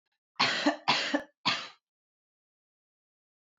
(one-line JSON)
{"three_cough_length": "3.6 s", "three_cough_amplitude": 8684, "three_cough_signal_mean_std_ratio": 0.38, "survey_phase": "alpha (2021-03-01 to 2021-08-12)", "age": "18-44", "gender": "Female", "wearing_mask": "No", "symptom_none": true, "smoker_status": "Never smoked", "respiratory_condition_asthma": false, "respiratory_condition_other": false, "recruitment_source": "REACT", "submission_delay": "1 day", "covid_test_result": "Negative", "covid_test_method": "RT-qPCR"}